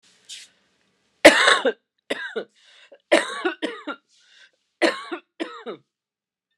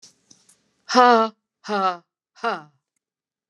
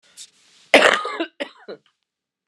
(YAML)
three_cough_length: 6.6 s
three_cough_amplitude: 29204
three_cough_signal_mean_std_ratio: 0.3
exhalation_length: 3.5 s
exhalation_amplitude: 28707
exhalation_signal_mean_std_ratio: 0.32
cough_length: 2.5 s
cough_amplitude: 29204
cough_signal_mean_std_ratio: 0.3
survey_phase: beta (2021-08-13 to 2022-03-07)
age: 45-64
gender: Female
wearing_mask: 'No'
symptom_cough_any: true
symptom_diarrhoea: true
symptom_fatigue: true
symptom_headache: true
smoker_status: Never smoked
respiratory_condition_asthma: false
respiratory_condition_other: false
recruitment_source: Test and Trace
submission_delay: 1 day
covid_test_result: Positive
covid_test_method: ePCR